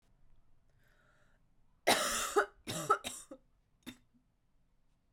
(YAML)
three_cough_length: 5.1 s
three_cough_amplitude: 7083
three_cough_signal_mean_std_ratio: 0.32
survey_phase: beta (2021-08-13 to 2022-03-07)
age: 18-44
gender: Female
wearing_mask: 'No'
symptom_cough_any: true
symptom_runny_or_blocked_nose: true
symptom_shortness_of_breath: true
symptom_headache: true
symptom_change_to_sense_of_smell_or_taste: true
symptom_loss_of_taste: true
smoker_status: Ex-smoker
respiratory_condition_asthma: false
respiratory_condition_other: false
recruitment_source: Test and Trace
submission_delay: 3 days
covid_test_result: Positive
covid_test_method: RT-qPCR